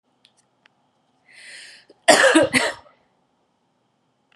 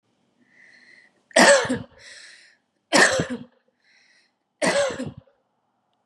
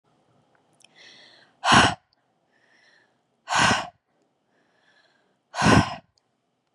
{"cough_length": "4.4 s", "cough_amplitude": 32653, "cough_signal_mean_std_ratio": 0.29, "three_cough_length": "6.1 s", "three_cough_amplitude": 28835, "three_cough_signal_mean_std_ratio": 0.34, "exhalation_length": "6.7 s", "exhalation_amplitude": 23686, "exhalation_signal_mean_std_ratio": 0.29, "survey_phase": "beta (2021-08-13 to 2022-03-07)", "age": "18-44", "gender": "Female", "wearing_mask": "No", "symptom_none": true, "smoker_status": "Ex-smoker", "respiratory_condition_asthma": false, "respiratory_condition_other": false, "recruitment_source": "REACT", "submission_delay": "1 day", "covid_test_result": "Negative", "covid_test_method": "RT-qPCR", "influenza_a_test_result": "Unknown/Void", "influenza_b_test_result": "Unknown/Void"}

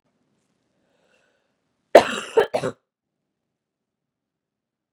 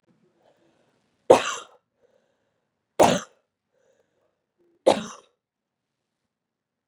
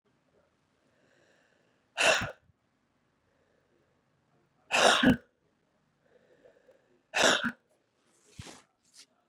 {"cough_length": "4.9 s", "cough_amplitude": 32768, "cough_signal_mean_std_ratio": 0.17, "three_cough_length": "6.9 s", "three_cough_amplitude": 31137, "three_cough_signal_mean_std_ratio": 0.19, "exhalation_length": "9.3 s", "exhalation_amplitude": 11499, "exhalation_signal_mean_std_ratio": 0.26, "survey_phase": "beta (2021-08-13 to 2022-03-07)", "age": "18-44", "gender": "Female", "wearing_mask": "No", "symptom_new_continuous_cough": true, "symptom_abdominal_pain": true, "symptom_fatigue": true, "symptom_fever_high_temperature": true, "symptom_other": true, "smoker_status": "Never smoked", "respiratory_condition_asthma": true, "respiratory_condition_other": false, "recruitment_source": "Test and Trace", "submission_delay": "2 days", "covid_test_result": "Positive", "covid_test_method": "RT-qPCR"}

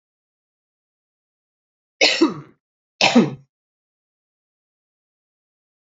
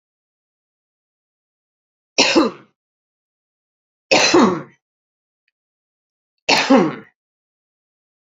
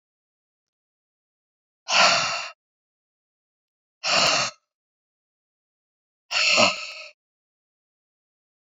{"cough_length": "5.8 s", "cough_amplitude": 28025, "cough_signal_mean_std_ratio": 0.24, "three_cough_length": "8.4 s", "three_cough_amplitude": 32768, "three_cough_signal_mean_std_ratio": 0.3, "exhalation_length": "8.8 s", "exhalation_amplitude": 23042, "exhalation_signal_mean_std_ratio": 0.32, "survey_phase": "beta (2021-08-13 to 2022-03-07)", "age": "45-64", "gender": "Female", "wearing_mask": "No", "symptom_fatigue": true, "symptom_fever_high_temperature": true, "symptom_onset": "3 days", "smoker_status": "Never smoked", "respiratory_condition_asthma": false, "respiratory_condition_other": false, "recruitment_source": "Test and Trace", "submission_delay": "2 days", "covid_test_result": "Positive", "covid_test_method": "RT-qPCR", "covid_ct_value": 17.6, "covid_ct_gene": "ORF1ab gene", "covid_ct_mean": 17.8, "covid_viral_load": "1400000 copies/ml", "covid_viral_load_category": "High viral load (>1M copies/ml)"}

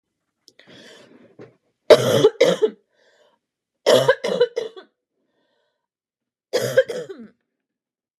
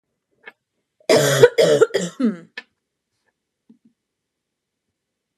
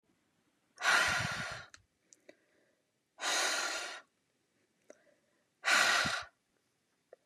{"three_cough_length": "8.2 s", "three_cough_amplitude": 32768, "three_cough_signal_mean_std_ratio": 0.32, "cough_length": "5.4 s", "cough_amplitude": 32768, "cough_signal_mean_std_ratio": 0.32, "exhalation_length": "7.3 s", "exhalation_amplitude": 5910, "exhalation_signal_mean_std_ratio": 0.42, "survey_phase": "beta (2021-08-13 to 2022-03-07)", "age": "18-44", "gender": "Female", "wearing_mask": "No", "symptom_cough_any": true, "smoker_status": "Ex-smoker", "respiratory_condition_asthma": true, "respiratory_condition_other": false, "recruitment_source": "REACT", "submission_delay": "7 days", "covid_test_result": "Negative", "covid_test_method": "RT-qPCR", "influenza_a_test_result": "Negative", "influenza_b_test_result": "Negative"}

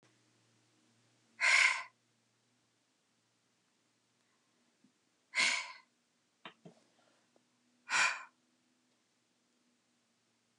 {"exhalation_length": "10.6 s", "exhalation_amplitude": 6390, "exhalation_signal_mean_std_ratio": 0.24, "survey_phase": "alpha (2021-03-01 to 2021-08-12)", "age": "45-64", "gender": "Female", "wearing_mask": "No", "symptom_none": true, "symptom_fatigue": true, "smoker_status": "Ex-smoker", "respiratory_condition_asthma": true, "respiratory_condition_other": false, "recruitment_source": "REACT", "submission_delay": "1 day", "covid_test_result": "Negative", "covid_test_method": "RT-qPCR"}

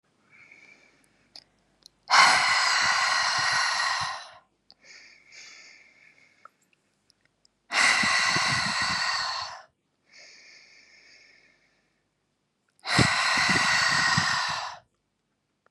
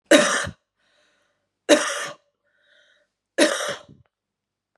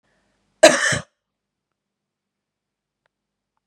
{"exhalation_length": "15.7 s", "exhalation_amplitude": 21272, "exhalation_signal_mean_std_ratio": 0.52, "three_cough_length": "4.8 s", "three_cough_amplitude": 32767, "three_cough_signal_mean_std_ratio": 0.32, "cough_length": "3.7 s", "cough_amplitude": 32768, "cough_signal_mean_std_ratio": 0.2, "survey_phase": "beta (2021-08-13 to 2022-03-07)", "age": "18-44", "gender": "Female", "wearing_mask": "No", "symptom_diarrhoea": true, "symptom_onset": "5 days", "smoker_status": "Never smoked", "respiratory_condition_asthma": true, "respiratory_condition_other": false, "recruitment_source": "REACT", "submission_delay": "1 day", "covid_test_result": "Negative", "covid_test_method": "RT-qPCR", "influenza_a_test_result": "Negative", "influenza_b_test_result": "Negative"}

